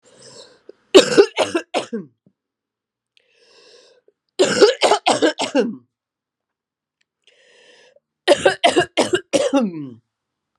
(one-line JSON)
{"three_cough_length": "10.6 s", "three_cough_amplitude": 32768, "three_cough_signal_mean_std_ratio": 0.37, "survey_phase": "beta (2021-08-13 to 2022-03-07)", "age": "65+", "gender": "Female", "wearing_mask": "No", "symptom_cough_any": true, "symptom_new_continuous_cough": true, "symptom_runny_or_blocked_nose": true, "symptom_shortness_of_breath": true, "symptom_fatigue": true, "symptom_headache": true, "symptom_other": true, "symptom_onset": "3 days", "smoker_status": "Ex-smoker", "respiratory_condition_asthma": false, "respiratory_condition_other": false, "recruitment_source": "Test and Trace", "submission_delay": "1 day", "covid_test_result": "Positive", "covid_test_method": "RT-qPCR", "covid_ct_value": 17.8, "covid_ct_gene": "ORF1ab gene", "covid_ct_mean": 18.3, "covid_viral_load": "960000 copies/ml", "covid_viral_load_category": "Low viral load (10K-1M copies/ml)"}